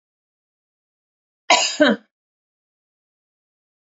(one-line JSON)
{"cough_length": "3.9 s", "cough_amplitude": 27356, "cough_signal_mean_std_ratio": 0.24, "survey_phase": "alpha (2021-03-01 to 2021-08-12)", "age": "45-64", "gender": "Female", "wearing_mask": "No", "symptom_none": true, "smoker_status": "Ex-smoker", "respiratory_condition_asthma": false, "respiratory_condition_other": false, "recruitment_source": "REACT", "submission_delay": "2 days", "covid_test_result": "Negative", "covid_test_method": "RT-qPCR"}